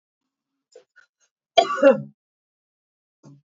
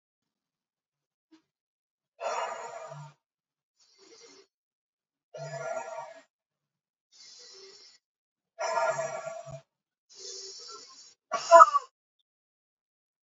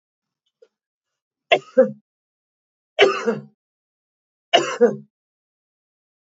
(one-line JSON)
{"cough_length": "3.5 s", "cough_amplitude": 27571, "cough_signal_mean_std_ratio": 0.23, "exhalation_length": "13.2 s", "exhalation_amplitude": 25678, "exhalation_signal_mean_std_ratio": 0.21, "three_cough_length": "6.2 s", "three_cough_amplitude": 29087, "three_cough_signal_mean_std_ratio": 0.27, "survey_phase": "beta (2021-08-13 to 2022-03-07)", "age": "65+", "gender": "Female", "wearing_mask": "No", "symptom_none": true, "smoker_status": "Ex-smoker", "respiratory_condition_asthma": false, "respiratory_condition_other": false, "recruitment_source": "REACT", "submission_delay": "1 day", "covid_test_result": "Negative", "covid_test_method": "RT-qPCR", "influenza_a_test_result": "Negative", "influenza_b_test_result": "Negative"}